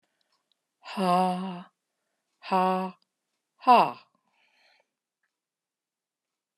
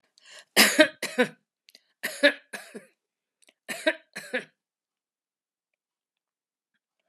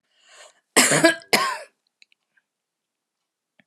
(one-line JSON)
{"exhalation_length": "6.6 s", "exhalation_amplitude": 15841, "exhalation_signal_mean_std_ratio": 0.3, "three_cough_length": "7.1 s", "three_cough_amplitude": 25806, "three_cough_signal_mean_std_ratio": 0.24, "cough_length": "3.7 s", "cough_amplitude": 30905, "cough_signal_mean_std_ratio": 0.31, "survey_phase": "alpha (2021-03-01 to 2021-08-12)", "age": "65+", "gender": "Female", "wearing_mask": "No", "symptom_none": true, "smoker_status": "Never smoked", "respiratory_condition_asthma": false, "respiratory_condition_other": false, "recruitment_source": "REACT", "submission_delay": "2 days", "covid_test_result": "Negative", "covid_test_method": "RT-qPCR"}